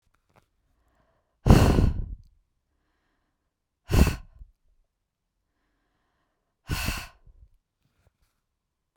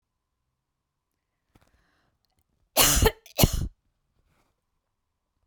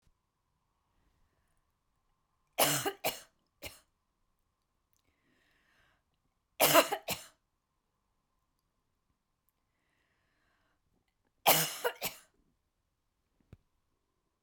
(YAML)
exhalation_length: 9.0 s
exhalation_amplitude: 27882
exhalation_signal_mean_std_ratio: 0.25
cough_length: 5.5 s
cough_amplitude: 18090
cough_signal_mean_std_ratio: 0.25
three_cough_length: 14.4 s
three_cough_amplitude: 12914
three_cough_signal_mean_std_ratio: 0.21
survey_phase: beta (2021-08-13 to 2022-03-07)
age: 45-64
gender: Female
wearing_mask: 'No'
symptom_cough_any: true
symptom_new_continuous_cough: true
symptom_runny_or_blocked_nose: true
symptom_sore_throat: true
symptom_onset: 1 day
smoker_status: Never smoked
respiratory_condition_asthma: false
respiratory_condition_other: false
recruitment_source: Test and Trace
submission_delay: 1 day
covid_test_result: Negative
covid_test_method: RT-qPCR